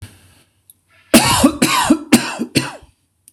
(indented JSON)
{
  "cough_length": "3.3 s",
  "cough_amplitude": 26028,
  "cough_signal_mean_std_ratio": 0.46,
  "survey_phase": "beta (2021-08-13 to 2022-03-07)",
  "age": "45-64",
  "gender": "Male",
  "wearing_mask": "No",
  "symptom_none": true,
  "smoker_status": "Never smoked",
  "respiratory_condition_asthma": false,
  "respiratory_condition_other": false,
  "recruitment_source": "REACT",
  "submission_delay": "3 days",
  "covid_test_result": "Negative",
  "covid_test_method": "RT-qPCR",
  "influenza_a_test_result": "Negative",
  "influenza_b_test_result": "Negative"
}